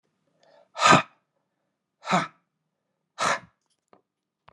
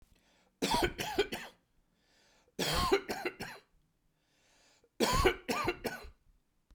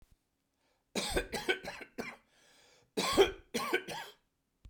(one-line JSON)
{"exhalation_length": "4.5 s", "exhalation_amplitude": 25305, "exhalation_signal_mean_std_ratio": 0.26, "three_cough_length": "6.7 s", "three_cough_amplitude": 8036, "three_cough_signal_mean_std_ratio": 0.44, "cough_length": "4.7 s", "cough_amplitude": 7928, "cough_signal_mean_std_ratio": 0.4, "survey_phase": "beta (2021-08-13 to 2022-03-07)", "age": "45-64", "gender": "Male", "wearing_mask": "No", "symptom_none": true, "smoker_status": "Ex-smoker", "respiratory_condition_asthma": false, "respiratory_condition_other": false, "recruitment_source": "REACT", "submission_delay": "2 days", "covid_test_result": "Negative", "covid_test_method": "RT-qPCR", "influenza_a_test_result": "Negative", "influenza_b_test_result": "Negative"}